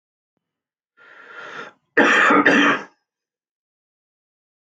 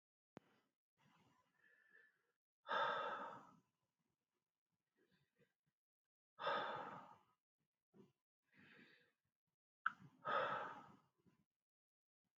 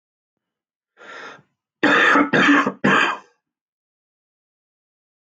{
  "cough_length": "4.6 s",
  "cough_amplitude": 28579,
  "cough_signal_mean_std_ratio": 0.37,
  "exhalation_length": "12.4 s",
  "exhalation_amplitude": 1829,
  "exhalation_signal_mean_std_ratio": 0.31,
  "three_cough_length": "5.3 s",
  "three_cough_amplitude": 23596,
  "three_cough_signal_mean_std_ratio": 0.4,
  "survey_phase": "beta (2021-08-13 to 2022-03-07)",
  "age": "18-44",
  "gender": "Male",
  "wearing_mask": "No",
  "symptom_cough_any": true,
  "symptom_sore_throat": true,
  "symptom_onset": "12 days",
  "smoker_status": "Ex-smoker",
  "respiratory_condition_asthma": true,
  "respiratory_condition_other": true,
  "recruitment_source": "REACT",
  "submission_delay": "0 days",
  "covid_test_result": "Negative",
  "covid_test_method": "RT-qPCR",
  "influenza_a_test_result": "Negative",
  "influenza_b_test_result": "Negative"
}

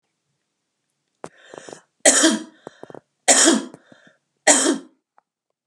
{
  "three_cough_length": "5.7 s",
  "three_cough_amplitude": 32764,
  "three_cough_signal_mean_std_ratio": 0.34,
  "survey_phase": "beta (2021-08-13 to 2022-03-07)",
  "age": "45-64",
  "gender": "Female",
  "wearing_mask": "No",
  "symptom_none": true,
  "smoker_status": "Ex-smoker",
  "respiratory_condition_asthma": false,
  "respiratory_condition_other": false,
  "recruitment_source": "REACT",
  "submission_delay": "2 days",
  "covid_test_result": "Negative",
  "covid_test_method": "RT-qPCR",
  "influenza_a_test_result": "Unknown/Void",
  "influenza_b_test_result": "Unknown/Void"
}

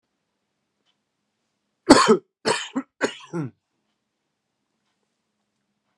{
  "cough_length": "6.0 s",
  "cough_amplitude": 32768,
  "cough_signal_mean_std_ratio": 0.23,
  "survey_phase": "beta (2021-08-13 to 2022-03-07)",
  "age": "45-64",
  "gender": "Male",
  "wearing_mask": "No",
  "symptom_new_continuous_cough": true,
  "symptom_runny_or_blocked_nose": true,
  "symptom_shortness_of_breath": true,
  "symptom_sore_throat": true,
  "symptom_fatigue": true,
  "symptom_headache": true,
  "symptom_change_to_sense_of_smell_or_taste": true,
  "symptom_onset": "3 days",
  "smoker_status": "Never smoked",
  "respiratory_condition_asthma": false,
  "respiratory_condition_other": false,
  "recruitment_source": "Test and Trace",
  "submission_delay": "1 day",
  "covid_test_result": "Positive",
  "covid_test_method": "ePCR"
}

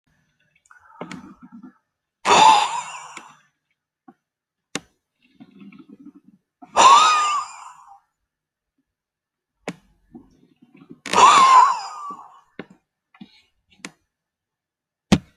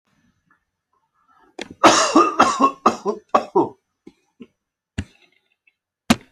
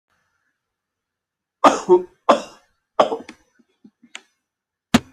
{
  "exhalation_length": "15.4 s",
  "exhalation_amplitude": 29596,
  "exhalation_signal_mean_std_ratio": 0.31,
  "cough_length": "6.3 s",
  "cough_amplitude": 32636,
  "cough_signal_mean_std_ratio": 0.34,
  "three_cough_length": "5.1 s",
  "three_cough_amplitude": 30746,
  "three_cough_signal_mean_std_ratio": 0.25,
  "survey_phase": "alpha (2021-03-01 to 2021-08-12)",
  "age": "45-64",
  "gender": "Male",
  "wearing_mask": "No",
  "symptom_none": true,
  "smoker_status": "Never smoked",
  "respiratory_condition_asthma": true,
  "respiratory_condition_other": false,
  "recruitment_source": "REACT",
  "submission_delay": "1 day",
  "covid_test_result": "Negative",
  "covid_test_method": "RT-qPCR"
}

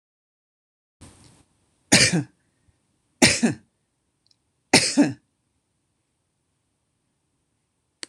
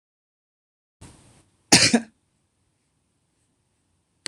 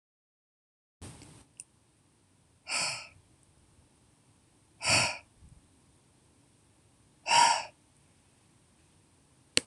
{
  "three_cough_length": "8.1 s",
  "three_cough_amplitude": 26027,
  "three_cough_signal_mean_std_ratio": 0.25,
  "cough_length": "4.3 s",
  "cough_amplitude": 26028,
  "cough_signal_mean_std_ratio": 0.19,
  "exhalation_length": "9.7 s",
  "exhalation_amplitude": 25745,
  "exhalation_signal_mean_std_ratio": 0.26,
  "survey_phase": "beta (2021-08-13 to 2022-03-07)",
  "age": "45-64",
  "gender": "Female",
  "wearing_mask": "No",
  "symptom_none": true,
  "smoker_status": "Ex-smoker",
  "respiratory_condition_asthma": false,
  "respiratory_condition_other": false,
  "recruitment_source": "REACT",
  "submission_delay": "1 day",
  "covid_test_result": "Negative",
  "covid_test_method": "RT-qPCR"
}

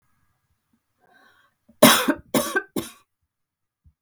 {
  "cough_length": "4.0 s",
  "cough_amplitude": 32768,
  "cough_signal_mean_std_ratio": 0.26,
  "survey_phase": "beta (2021-08-13 to 2022-03-07)",
  "age": "45-64",
  "gender": "Female",
  "wearing_mask": "No",
  "symptom_none": true,
  "smoker_status": "Never smoked",
  "respiratory_condition_asthma": false,
  "respiratory_condition_other": false,
  "recruitment_source": "REACT",
  "submission_delay": "1 day",
  "covid_test_result": "Negative",
  "covid_test_method": "RT-qPCR",
  "influenza_a_test_result": "Negative",
  "influenza_b_test_result": "Negative"
}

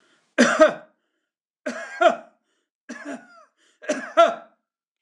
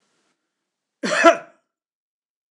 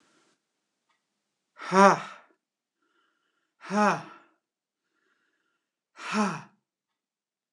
{
  "three_cough_length": "5.0 s",
  "three_cough_amplitude": 26027,
  "three_cough_signal_mean_std_ratio": 0.33,
  "cough_length": "2.5 s",
  "cough_amplitude": 26028,
  "cough_signal_mean_std_ratio": 0.25,
  "exhalation_length": "7.5 s",
  "exhalation_amplitude": 22834,
  "exhalation_signal_mean_std_ratio": 0.24,
  "survey_phase": "beta (2021-08-13 to 2022-03-07)",
  "age": "65+",
  "gender": "Male",
  "wearing_mask": "No",
  "symptom_none": true,
  "smoker_status": "Ex-smoker",
  "respiratory_condition_asthma": false,
  "respiratory_condition_other": false,
  "recruitment_source": "REACT",
  "submission_delay": "1 day",
  "covid_test_result": "Negative",
  "covid_test_method": "RT-qPCR",
  "influenza_a_test_result": "Negative",
  "influenza_b_test_result": "Negative"
}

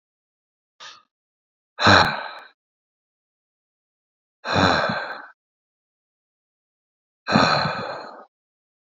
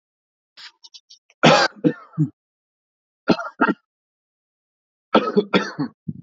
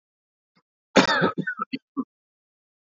{
  "exhalation_length": "9.0 s",
  "exhalation_amplitude": 29377,
  "exhalation_signal_mean_std_ratio": 0.32,
  "three_cough_length": "6.2 s",
  "three_cough_amplitude": 28498,
  "three_cough_signal_mean_std_ratio": 0.33,
  "cough_length": "3.0 s",
  "cough_amplitude": 27937,
  "cough_signal_mean_std_ratio": 0.31,
  "survey_phase": "alpha (2021-03-01 to 2021-08-12)",
  "age": "18-44",
  "gender": "Male",
  "wearing_mask": "No",
  "symptom_headache": true,
  "smoker_status": "Never smoked",
  "respiratory_condition_asthma": true,
  "respiratory_condition_other": false,
  "recruitment_source": "Test and Trace",
  "submission_delay": "2 days",
  "covid_test_result": "Positive",
  "covid_test_method": "RT-qPCR",
  "covid_ct_value": 29.9,
  "covid_ct_gene": "N gene",
  "covid_ct_mean": 29.9,
  "covid_viral_load": "150 copies/ml",
  "covid_viral_load_category": "Minimal viral load (< 10K copies/ml)"
}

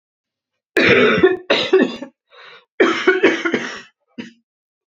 {
  "three_cough_length": "4.9 s",
  "three_cough_amplitude": 28507,
  "three_cough_signal_mean_std_ratio": 0.5,
  "survey_phase": "beta (2021-08-13 to 2022-03-07)",
  "age": "18-44",
  "gender": "Female",
  "wearing_mask": "No",
  "symptom_cough_any": true,
  "symptom_runny_or_blocked_nose": true,
  "symptom_sore_throat": true,
  "symptom_fatigue": true,
  "symptom_fever_high_temperature": true,
  "symptom_onset": "3 days",
  "smoker_status": "Ex-smoker",
  "respiratory_condition_asthma": false,
  "respiratory_condition_other": false,
  "recruitment_source": "REACT",
  "submission_delay": "1 day",
  "covid_test_result": "Negative",
  "covid_test_method": "RT-qPCR",
  "influenza_a_test_result": "Unknown/Void",
  "influenza_b_test_result": "Unknown/Void"
}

